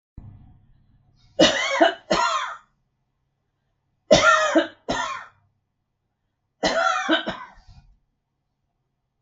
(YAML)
three_cough_length: 9.2 s
three_cough_amplitude: 32086
three_cough_signal_mean_std_ratio: 0.39
survey_phase: beta (2021-08-13 to 2022-03-07)
age: 65+
gender: Female
wearing_mask: 'No'
symptom_none: true
smoker_status: Never smoked
respiratory_condition_asthma: false
respiratory_condition_other: false
recruitment_source: REACT
submission_delay: 2 days
covid_test_result: Negative
covid_test_method: RT-qPCR
influenza_a_test_result: Negative
influenza_b_test_result: Negative